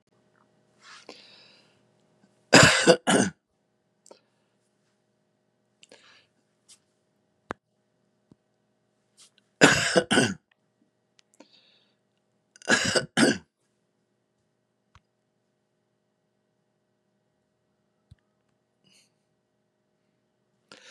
{"cough_length": "20.9 s", "cough_amplitude": 31475, "cough_signal_mean_std_ratio": 0.21, "survey_phase": "beta (2021-08-13 to 2022-03-07)", "age": "65+", "gender": "Male", "wearing_mask": "No", "symptom_none": true, "smoker_status": "Never smoked", "respiratory_condition_asthma": false, "respiratory_condition_other": false, "recruitment_source": "REACT", "submission_delay": "5 days", "covid_test_result": "Negative", "covid_test_method": "RT-qPCR", "influenza_a_test_result": "Negative", "influenza_b_test_result": "Negative"}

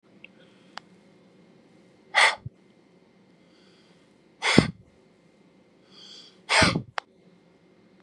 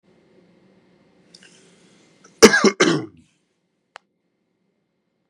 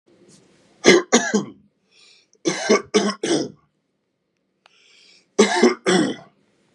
{"exhalation_length": "8.0 s", "exhalation_amplitude": 32570, "exhalation_signal_mean_std_ratio": 0.25, "cough_length": "5.3 s", "cough_amplitude": 32768, "cough_signal_mean_std_ratio": 0.22, "three_cough_length": "6.7 s", "three_cough_amplitude": 32768, "three_cough_signal_mean_std_ratio": 0.39, "survey_phase": "beta (2021-08-13 to 2022-03-07)", "age": "45-64", "gender": "Male", "wearing_mask": "No", "symptom_none": true, "smoker_status": "Ex-smoker", "respiratory_condition_asthma": true, "respiratory_condition_other": false, "recruitment_source": "REACT", "submission_delay": "2 days", "covid_test_result": "Negative", "covid_test_method": "RT-qPCR", "influenza_a_test_result": "Negative", "influenza_b_test_result": "Negative"}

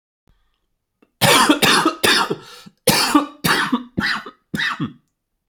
{"cough_length": "5.5 s", "cough_amplitude": 32768, "cough_signal_mean_std_ratio": 0.53, "survey_phase": "alpha (2021-03-01 to 2021-08-12)", "age": "18-44", "gender": "Male", "wearing_mask": "No", "symptom_none": true, "smoker_status": "Never smoked", "respiratory_condition_asthma": false, "respiratory_condition_other": false, "recruitment_source": "REACT", "submission_delay": "1 day", "covid_test_result": "Negative", "covid_test_method": "RT-qPCR"}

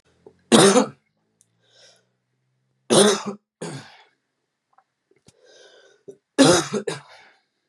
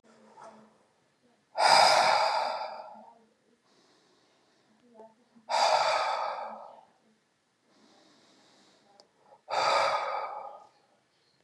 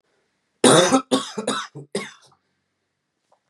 {"three_cough_length": "7.7 s", "three_cough_amplitude": 32768, "three_cough_signal_mean_std_ratio": 0.3, "exhalation_length": "11.4 s", "exhalation_amplitude": 13199, "exhalation_signal_mean_std_ratio": 0.41, "cough_length": "3.5 s", "cough_amplitude": 31429, "cough_signal_mean_std_ratio": 0.35, "survey_phase": "beta (2021-08-13 to 2022-03-07)", "age": "18-44", "gender": "Male", "wearing_mask": "No", "symptom_cough_any": true, "symptom_runny_or_blocked_nose": true, "symptom_sore_throat": true, "symptom_abdominal_pain": true, "symptom_fatigue": true, "symptom_headache": true, "smoker_status": "Current smoker (1 to 10 cigarettes per day)", "respiratory_condition_asthma": false, "respiratory_condition_other": false, "recruitment_source": "Test and Trace", "submission_delay": "2 days", "covid_test_result": "Positive", "covid_test_method": "LFT"}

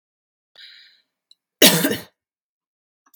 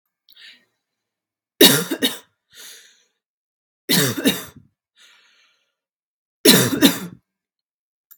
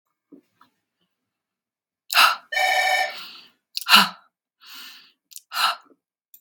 {"cough_length": "3.2 s", "cough_amplitude": 32768, "cough_signal_mean_std_ratio": 0.24, "three_cough_length": "8.2 s", "three_cough_amplitude": 32768, "three_cough_signal_mean_std_ratio": 0.3, "exhalation_length": "6.4 s", "exhalation_amplitude": 32768, "exhalation_signal_mean_std_ratio": 0.34, "survey_phase": "beta (2021-08-13 to 2022-03-07)", "age": "18-44", "gender": "Female", "wearing_mask": "No", "symptom_fatigue": true, "smoker_status": "Never smoked", "respiratory_condition_asthma": false, "respiratory_condition_other": false, "recruitment_source": "REACT", "submission_delay": "2 days", "covid_test_result": "Negative", "covid_test_method": "RT-qPCR", "influenza_a_test_result": "Unknown/Void", "influenza_b_test_result": "Unknown/Void"}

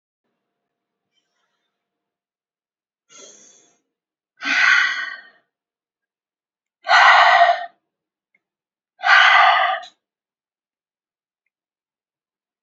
{"exhalation_length": "12.6 s", "exhalation_amplitude": 31643, "exhalation_signal_mean_std_ratio": 0.32, "survey_phase": "beta (2021-08-13 to 2022-03-07)", "age": "65+", "gender": "Female", "wearing_mask": "No", "symptom_cough_any": true, "symptom_runny_or_blocked_nose": true, "symptom_headache": true, "symptom_onset": "6 days", "smoker_status": "Ex-smoker", "respiratory_condition_asthma": false, "respiratory_condition_other": false, "recruitment_source": "Test and Trace", "submission_delay": "1 day", "covid_test_result": "Positive", "covid_test_method": "RT-qPCR", "covid_ct_value": 20.7, "covid_ct_gene": "N gene", "covid_ct_mean": 21.9, "covid_viral_load": "65000 copies/ml", "covid_viral_load_category": "Low viral load (10K-1M copies/ml)"}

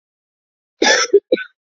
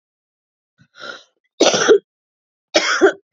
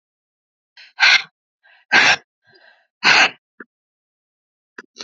{"cough_length": "1.6 s", "cough_amplitude": 29556, "cough_signal_mean_std_ratio": 0.39, "three_cough_length": "3.3 s", "three_cough_amplitude": 29651, "three_cough_signal_mean_std_ratio": 0.37, "exhalation_length": "5.0 s", "exhalation_amplitude": 30956, "exhalation_signal_mean_std_ratio": 0.31, "survey_phase": "beta (2021-08-13 to 2022-03-07)", "age": "18-44", "gender": "Female", "wearing_mask": "No", "symptom_cough_any": true, "symptom_runny_or_blocked_nose": true, "symptom_sore_throat": true, "symptom_abdominal_pain": true, "symptom_headache": true, "symptom_onset": "2 days", "smoker_status": "Ex-smoker", "respiratory_condition_asthma": false, "respiratory_condition_other": false, "recruitment_source": "Test and Trace", "submission_delay": "1 day", "covid_test_result": "Positive", "covid_test_method": "RT-qPCR", "covid_ct_value": 15.7, "covid_ct_gene": "ORF1ab gene", "covid_ct_mean": 16.4, "covid_viral_load": "4100000 copies/ml", "covid_viral_load_category": "High viral load (>1M copies/ml)"}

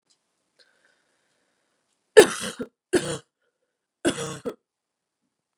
{"three_cough_length": "5.6 s", "three_cough_amplitude": 32179, "three_cough_signal_mean_std_ratio": 0.19, "survey_phase": "beta (2021-08-13 to 2022-03-07)", "age": "18-44", "gender": "Female", "wearing_mask": "No", "symptom_cough_any": true, "symptom_runny_or_blocked_nose": true, "symptom_sore_throat": true, "symptom_onset": "3 days", "smoker_status": "Never smoked", "respiratory_condition_asthma": false, "respiratory_condition_other": false, "recruitment_source": "Test and Trace", "submission_delay": "2 days", "covid_test_result": "Positive", "covid_test_method": "RT-qPCR", "covid_ct_value": 24.6, "covid_ct_gene": "N gene"}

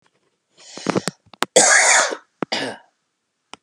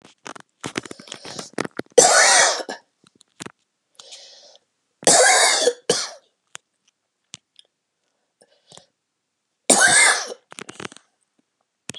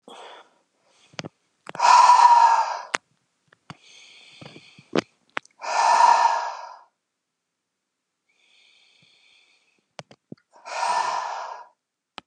{"cough_length": "3.6 s", "cough_amplitude": 32768, "cough_signal_mean_std_ratio": 0.39, "three_cough_length": "12.0 s", "three_cough_amplitude": 32768, "three_cough_signal_mean_std_ratio": 0.35, "exhalation_length": "12.3 s", "exhalation_amplitude": 32123, "exhalation_signal_mean_std_ratio": 0.36, "survey_phase": "beta (2021-08-13 to 2022-03-07)", "age": "45-64", "gender": "Male", "wearing_mask": "No", "symptom_none": true, "smoker_status": "Never smoked", "respiratory_condition_asthma": false, "respiratory_condition_other": false, "recruitment_source": "REACT", "submission_delay": "2 days", "covid_test_result": "Negative", "covid_test_method": "RT-qPCR", "influenza_a_test_result": "Negative", "influenza_b_test_result": "Negative"}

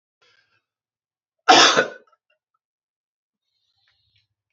{"cough_length": "4.5 s", "cough_amplitude": 30691, "cough_signal_mean_std_ratio": 0.22, "survey_phase": "beta (2021-08-13 to 2022-03-07)", "age": "18-44", "gender": "Male", "wearing_mask": "No", "symptom_none": true, "smoker_status": "Never smoked", "respiratory_condition_asthma": false, "respiratory_condition_other": false, "recruitment_source": "REACT", "submission_delay": "1 day", "covid_test_result": "Negative", "covid_test_method": "RT-qPCR", "influenza_a_test_result": "Negative", "influenza_b_test_result": "Negative"}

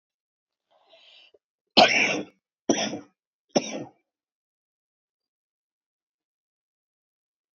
{"three_cough_length": "7.6 s", "three_cough_amplitude": 27736, "three_cough_signal_mean_std_ratio": 0.23, "survey_phase": "alpha (2021-03-01 to 2021-08-12)", "age": "45-64", "gender": "Female", "wearing_mask": "No", "symptom_cough_any": true, "symptom_shortness_of_breath": true, "symptom_fatigue": true, "smoker_status": "Current smoker (11 or more cigarettes per day)", "respiratory_condition_asthma": true, "respiratory_condition_other": true, "recruitment_source": "REACT", "submission_delay": "2 days", "covid_test_result": "Negative", "covid_test_method": "RT-qPCR"}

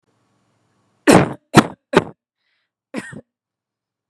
{"cough_length": "4.1 s", "cough_amplitude": 32768, "cough_signal_mean_std_ratio": 0.24, "survey_phase": "beta (2021-08-13 to 2022-03-07)", "age": "18-44", "gender": "Female", "wearing_mask": "No", "symptom_none": true, "smoker_status": "Never smoked", "respiratory_condition_asthma": false, "respiratory_condition_other": false, "recruitment_source": "REACT", "submission_delay": "1 day", "covid_test_result": "Negative", "covid_test_method": "RT-qPCR"}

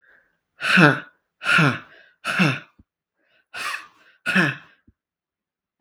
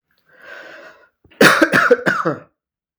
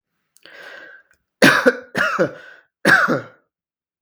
{"exhalation_length": "5.8 s", "exhalation_amplitude": 31940, "exhalation_signal_mean_std_ratio": 0.38, "cough_length": "3.0 s", "cough_amplitude": 32768, "cough_signal_mean_std_ratio": 0.41, "three_cough_length": "4.0 s", "three_cough_amplitude": 32768, "three_cough_signal_mean_std_ratio": 0.39, "survey_phase": "beta (2021-08-13 to 2022-03-07)", "age": "18-44", "gender": "Male", "wearing_mask": "No", "symptom_headache": true, "symptom_onset": "13 days", "smoker_status": "Never smoked", "respiratory_condition_asthma": true, "respiratory_condition_other": false, "recruitment_source": "REACT", "submission_delay": "3 days", "covid_test_result": "Negative", "covid_test_method": "RT-qPCR", "influenza_a_test_result": "Negative", "influenza_b_test_result": "Negative"}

